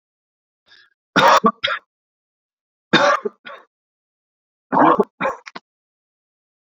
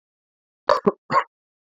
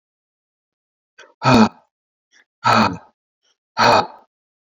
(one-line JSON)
{"three_cough_length": "6.7 s", "three_cough_amplitude": 32767, "three_cough_signal_mean_std_ratio": 0.32, "cough_length": "1.8 s", "cough_amplitude": 26425, "cough_signal_mean_std_ratio": 0.28, "exhalation_length": "4.8 s", "exhalation_amplitude": 30994, "exhalation_signal_mean_std_ratio": 0.33, "survey_phase": "beta (2021-08-13 to 2022-03-07)", "age": "45-64", "gender": "Male", "wearing_mask": "No", "symptom_none": true, "smoker_status": "Never smoked", "respiratory_condition_asthma": false, "respiratory_condition_other": false, "recruitment_source": "REACT", "submission_delay": "2 days", "covid_test_result": "Negative", "covid_test_method": "RT-qPCR"}